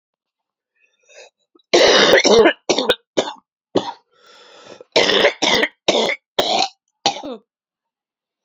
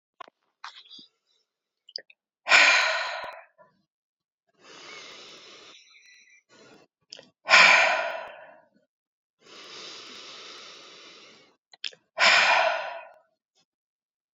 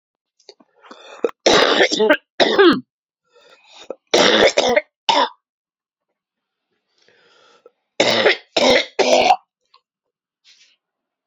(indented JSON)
{
  "cough_length": "8.4 s",
  "cough_amplitude": 32767,
  "cough_signal_mean_std_ratio": 0.44,
  "exhalation_length": "14.3 s",
  "exhalation_amplitude": 22849,
  "exhalation_signal_mean_std_ratio": 0.32,
  "three_cough_length": "11.3 s",
  "three_cough_amplitude": 32768,
  "three_cough_signal_mean_std_ratio": 0.42,
  "survey_phase": "alpha (2021-03-01 to 2021-08-12)",
  "age": "45-64",
  "gender": "Female",
  "wearing_mask": "No",
  "symptom_new_continuous_cough": true,
  "symptom_fatigue": true,
  "symptom_fever_high_temperature": true,
  "symptom_headache": true,
  "symptom_change_to_sense_of_smell_or_taste": true,
  "symptom_loss_of_taste": true,
  "symptom_onset": "2 days",
  "smoker_status": "Never smoked",
  "respiratory_condition_asthma": false,
  "respiratory_condition_other": false,
  "recruitment_source": "Test and Trace",
  "submission_delay": "2 days",
  "covid_test_result": "Positive",
  "covid_test_method": "RT-qPCR",
  "covid_ct_value": 18.1,
  "covid_ct_gene": "ORF1ab gene",
  "covid_ct_mean": 18.5,
  "covid_viral_load": "870000 copies/ml",
  "covid_viral_load_category": "Low viral load (10K-1M copies/ml)"
}